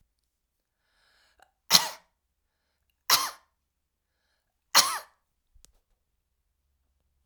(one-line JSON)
{"three_cough_length": "7.3 s", "three_cough_amplitude": 25925, "three_cough_signal_mean_std_ratio": 0.19, "survey_phase": "alpha (2021-03-01 to 2021-08-12)", "age": "65+", "gender": "Female", "wearing_mask": "No", "symptom_none": true, "smoker_status": "Ex-smoker", "respiratory_condition_asthma": false, "respiratory_condition_other": false, "recruitment_source": "REACT", "submission_delay": "1 day", "covid_test_result": "Negative", "covid_test_method": "RT-qPCR"}